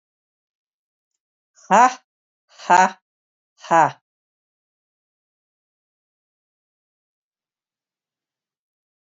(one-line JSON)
{"exhalation_length": "9.1 s", "exhalation_amplitude": 29275, "exhalation_signal_mean_std_ratio": 0.19, "survey_phase": "alpha (2021-03-01 to 2021-08-12)", "age": "65+", "gender": "Female", "wearing_mask": "No", "symptom_none": true, "smoker_status": "Ex-smoker", "respiratory_condition_asthma": false, "respiratory_condition_other": false, "recruitment_source": "REACT", "submission_delay": "1 day", "covid_test_result": "Negative", "covid_test_method": "RT-qPCR"}